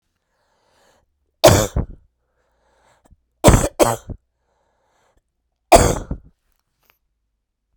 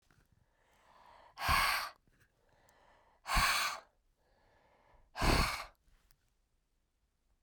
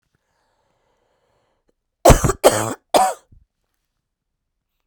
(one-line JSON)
{"three_cough_length": "7.8 s", "three_cough_amplitude": 32768, "three_cough_signal_mean_std_ratio": 0.26, "exhalation_length": "7.4 s", "exhalation_amplitude": 4481, "exhalation_signal_mean_std_ratio": 0.36, "cough_length": "4.9 s", "cough_amplitude": 32768, "cough_signal_mean_std_ratio": 0.26, "survey_phase": "beta (2021-08-13 to 2022-03-07)", "age": "45-64", "gender": "Female", "wearing_mask": "No", "symptom_cough_any": true, "symptom_shortness_of_breath": true, "symptom_fatigue": true, "smoker_status": "Never smoked", "respiratory_condition_asthma": false, "respiratory_condition_other": false, "recruitment_source": "Test and Trace", "submission_delay": "1 day", "covid_test_result": "Positive", "covid_test_method": "RT-qPCR", "covid_ct_value": 22.8, "covid_ct_gene": "ORF1ab gene", "covid_ct_mean": 23.3, "covid_viral_load": "22000 copies/ml", "covid_viral_load_category": "Low viral load (10K-1M copies/ml)"}